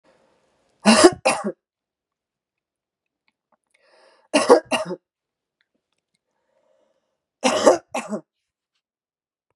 {"three_cough_length": "9.6 s", "three_cough_amplitude": 32767, "three_cough_signal_mean_std_ratio": 0.26, "survey_phase": "beta (2021-08-13 to 2022-03-07)", "age": "45-64", "gender": "Female", "wearing_mask": "No", "symptom_cough_any": true, "symptom_runny_or_blocked_nose": true, "symptom_fatigue": true, "symptom_change_to_sense_of_smell_or_taste": true, "symptom_onset": "3 days", "smoker_status": "Ex-smoker", "respiratory_condition_asthma": true, "respiratory_condition_other": false, "recruitment_source": "Test and Trace", "submission_delay": "2 days", "covid_test_result": "Positive", "covid_test_method": "RT-qPCR", "covid_ct_value": 12.9, "covid_ct_gene": "ORF1ab gene"}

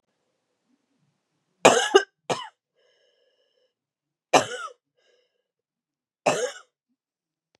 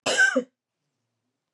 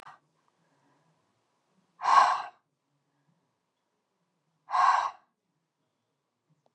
{"three_cough_length": "7.6 s", "three_cough_amplitude": 32714, "three_cough_signal_mean_std_ratio": 0.22, "cough_length": "1.5 s", "cough_amplitude": 10720, "cough_signal_mean_std_ratio": 0.38, "exhalation_length": "6.7 s", "exhalation_amplitude": 14266, "exhalation_signal_mean_std_ratio": 0.26, "survey_phase": "beta (2021-08-13 to 2022-03-07)", "age": "18-44", "gender": "Female", "wearing_mask": "No", "symptom_cough_any": true, "symptom_runny_or_blocked_nose": true, "symptom_sore_throat": true, "symptom_fever_high_temperature": true, "symptom_headache": true, "symptom_loss_of_taste": true, "symptom_onset": "3 days", "smoker_status": "Never smoked", "respiratory_condition_asthma": false, "respiratory_condition_other": false, "recruitment_source": "Test and Trace", "submission_delay": "2 days", "covid_test_result": "Positive", "covid_test_method": "RT-qPCR", "covid_ct_value": 18.2, "covid_ct_gene": "N gene"}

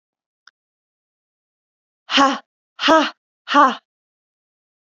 {"exhalation_length": "4.9 s", "exhalation_amplitude": 29008, "exhalation_signal_mean_std_ratio": 0.28, "survey_phase": "beta (2021-08-13 to 2022-03-07)", "age": "18-44", "gender": "Female", "wearing_mask": "No", "symptom_none": true, "smoker_status": "Never smoked", "respiratory_condition_asthma": true, "respiratory_condition_other": false, "recruitment_source": "REACT", "submission_delay": "2 days", "covid_test_result": "Negative", "covid_test_method": "RT-qPCR", "influenza_a_test_result": "Negative", "influenza_b_test_result": "Negative"}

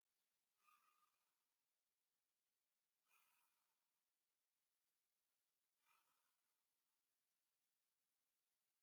{"exhalation_length": "8.8 s", "exhalation_amplitude": 28, "exhalation_signal_mean_std_ratio": 0.43, "survey_phase": "beta (2021-08-13 to 2022-03-07)", "age": "65+", "gender": "Male", "wearing_mask": "No", "symptom_cough_any": true, "symptom_sore_throat": true, "smoker_status": "Never smoked", "respiratory_condition_asthma": false, "respiratory_condition_other": false, "recruitment_source": "Test and Trace", "submission_delay": "2 days", "covid_test_result": "Positive", "covid_test_method": "RT-qPCR", "covid_ct_value": 28.4, "covid_ct_gene": "ORF1ab gene", "covid_ct_mean": 28.9, "covid_viral_load": "330 copies/ml", "covid_viral_load_category": "Minimal viral load (< 10K copies/ml)"}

